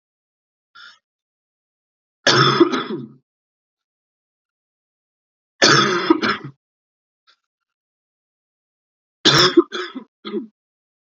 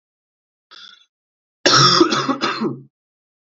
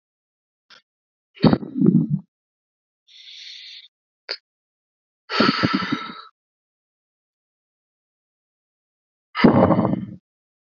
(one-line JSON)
{"three_cough_length": "11.0 s", "three_cough_amplitude": 32235, "three_cough_signal_mean_std_ratio": 0.31, "cough_length": "3.5 s", "cough_amplitude": 30633, "cough_signal_mean_std_ratio": 0.42, "exhalation_length": "10.8 s", "exhalation_amplitude": 27898, "exhalation_signal_mean_std_ratio": 0.32, "survey_phase": "beta (2021-08-13 to 2022-03-07)", "age": "18-44", "gender": "Male", "wearing_mask": "No", "symptom_cough_any": true, "symptom_new_continuous_cough": true, "symptom_sore_throat": true, "smoker_status": "Never smoked", "respiratory_condition_asthma": false, "respiratory_condition_other": false, "recruitment_source": "Test and Trace", "submission_delay": "1 day", "covid_test_result": "Positive", "covid_test_method": "LFT"}